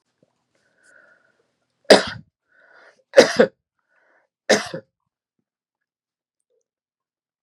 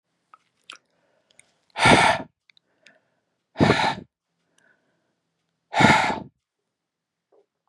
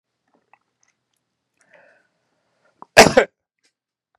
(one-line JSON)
{"three_cough_length": "7.4 s", "three_cough_amplitude": 32768, "three_cough_signal_mean_std_ratio": 0.19, "exhalation_length": "7.7 s", "exhalation_amplitude": 29500, "exhalation_signal_mean_std_ratio": 0.3, "cough_length": "4.2 s", "cough_amplitude": 32768, "cough_signal_mean_std_ratio": 0.16, "survey_phase": "beta (2021-08-13 to 2022-03-07)", "age": "65+", "gender": "Male", "wearing_mask": "No", "symptom_none": true, "smoker_status": "Never smoked", "respiratory_condition_asthma": false, "respiratory_condition_other": false, "recruitment_source": "REACT", "submission_delay": "2 days", "covid_test_result": "Negative", "covid_test_method": "RT-qPCR", "influenza_a_test_result": "Negative", "influenza_b_test_result": "Negative"}